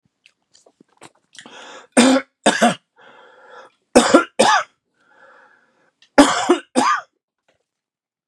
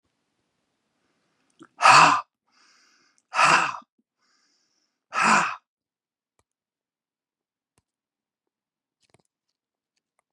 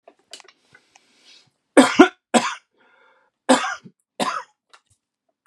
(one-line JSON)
{"three_cough_length": "8.3 s", "three_cough_amplitude": 32768, "three_cough_signal_mean_std_ratio": 0.34, "exhalation_length": "10.3 s", "exhalation_amplitude": 25427, "exhalation_signal_mean_std_ratio": 0.25, "cough_length": "5.5 s", "cough_amplitude": 32741, "cough_signal_mean_std_ratio": 0.26, "survey_phase": "beta (2021-08-13 to 2022-03-07)", "age": "45-64", "gender": "Male", "wearing_mask": "No", "symptom_none": true, "smoker_status": "Ex-smoker", "respiratory_condition_asthma": false, "respiratory_condition_other": false, "recruitment_source": "REACT", "submission_delay": "2 days", "covid_test_result": "Negative", "covid_test_method": "RT-qPCR", "influenza_a_test_result": "Negative", "influenza_b_test_result": "Negative"}